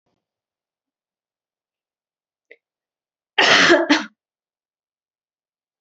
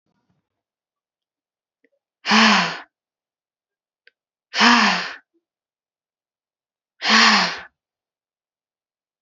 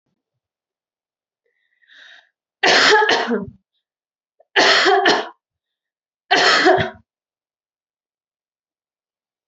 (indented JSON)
{
  "cough_length": "5.8 s",
  "cough_amplitude": 31378,
  "cough_signal_mean_std_ratio": 0.25,
  "exhalation_length": "9.2 s",
  "exhalation_amplitude": 29741,
  "exhalation_signal_mean_std_ratio": 0.31,
  "three_cough_length": "9.5 s",
  "three_cough_amplitude": 26173,
  "three_cough_signal_mean_std_ratio": 0.38,
  "survey_phase": "beta (2021-08-13 to 2022-03-07)",
  "age": "18-44",
  "gender": "Female",
  "wearing_mask": "No",
  "symptom_headache": true,
  "smoker_status": "Never smoked",
  "respiratory_condition_asthma": false,
  "respiratory_condition_other": false,
  "recruitment_source": "REACT",
  "submission_delay": "3 days",
  "covid_test_result": "Negative",
  "covid_test_method": "RT-qPCR",
  "influenza_a_test_result": "Negative",
  "influenza_b_test_result": "Negative"
}